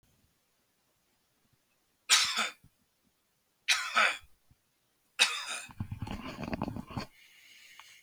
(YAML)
three_cough_length: 8.0 s
three_cough_amplitude: 11433
three_cough_signal_mean_std_ratio: 0.35
survey_phase: beta (2021-08-13 to 2022-03-07)
age: 65+
gender: Male
wearing_mask: 'No'
symptom_runny_or_blocked_nose: true
smoker_status: Never smoked
respiratory_condition_asthma: false
respiratory_condition_other: false
recruitment_source: REACT
submission_delay: 2 days
covid_test_result: Negative
covid_test_method: RT-qPCR
influenza_a_test_result: Negative
influenza_b_test_result: Negative